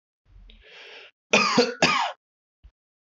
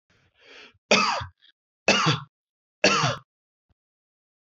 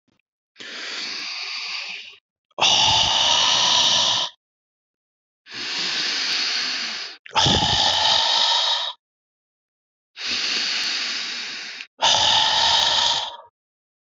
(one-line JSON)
{"cough_length": "3.1 s", "cough_amplitude": 20450, "cough_signal_mean_std_ratio": 0.39, "three_cough_length": "4.4 s", "three_cough_amplitude": 17681, "three_cough_signal_mean_std_ratio": 0.37, "exhalation_length": "14.2 s", "exhalation_amplitude": 22001, "exhalation_signal_mean_std_ratio": 0.69, "survey_phase": "beta (2021-08-13 to 2022-03-07)", "age": "18-44", "gender": "Male", "wearing_mask": "No", "symptom_none": true, "smoker_status": "Never smoked", "respiratory_condition_asthma": false, "respiratory_condition_other": false, "recruitment_source": "REACT", "submission_delay": "2 days", "covid_test_result": "Negative", "covid_test_method": "RT-qPCR", "influenza_a_test_result": "Negative", "influenza_b_test_result": "Negative"}